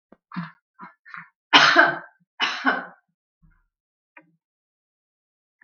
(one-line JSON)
{"three_cough_length": "5.6 s", "three_cough_amplitude": 32768, "three_cough_signal_mean_std_ratio": 0.28, "survey_phase": "beta (2021-08-13 to 2022-03-07)", "age": "65+", "gender": "Female", "wearing_mask": "No", "symptom_none": true, "smoker_status": "Never smoked", "respiratory_condition_asthma": false, "respiratory_condition_other": false, "recruitment_source": "REACT", "submission_delay": "6 days", "covid_test_result": "Negative", "covid_test_method": "RT-qPCR"}